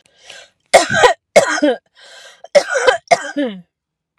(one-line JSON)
{"cough_length": "4.2 s", "cough_amplitude": 32768, "cough_signal_mean_std_ratio": 0.43, "survey_phase": "alpha (2021-03-01 to 2021-08-12)", "age": "45-64", "gender": "Female", "wearing_mask": "No", "symptom_none": true, "smoker_status": "Ex-smoker", "respiratory_condition_asthma": false, "respiratory_condition_other": false, "recruitment_source": "REACT", "submission_delay": "2 days", "covid_test_result": "Negative", "covid_test_method": "RT-qPCR"}